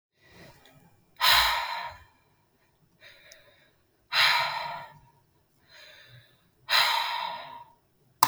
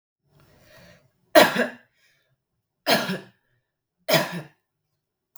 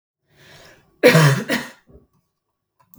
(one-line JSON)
{"exhalation_length": "8.3 s", "exhalation_amplitude": 32766, "exhalation_signal_mean_std_ratio": 0.38, "three_cough_length": "5.4 s", "three_cough_amplitude": 32768, "three_cough_signal_mean_std_ratio": 0.27, "cough_length": "3.0 s", "cough_amplitude": 32768, "cough_signal_mean_std_ratio": 0.33, "survey_phase": "beta (2021-08-13 to 2022-03-07)", "age": "18-44", "gender": "Female", "wearing_mask": "No", "symptom_none": true, "smoker_status": "Never smoked", "respiratory_condition_asthma": true, "respiratory_condition_other": false, "recruitment_source": "REACT", "submission_delay": "1 day", "covid_test_result": "Negative", "covid_test_method": "RT-qPCR"}